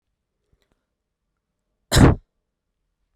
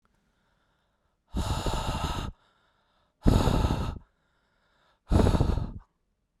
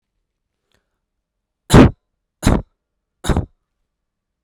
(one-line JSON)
{"cough_length": "3.2 s", "cough_amplitude": 32767, "cough_signal_mean_std_ratio": 0.21, "exhalation_length": "6.4 s", "exhalation_amplitude": 18988, "exhalation_signal_mean_std_ratio": 0.44, "three_cough_length": "4.4 s", "three_cough_amplitude": 32768, "three_cough_signal_mean_std_ratio": 0.23, "survey_phase": "beta (2021-08-13 to 2022-03-07)", "age": "18-44", "gender": "Male", "wearing_mask": "No", "symptom_none": true, "smoker_status": "Never smoked", "respiratory_condition_asthma": false, "respiratory_condition_other": false, "recruitment_source": "REACT", "submission_delay": "1 day", "covid_test_result": "Negative", "covid_test_method": "RT-qPCR"}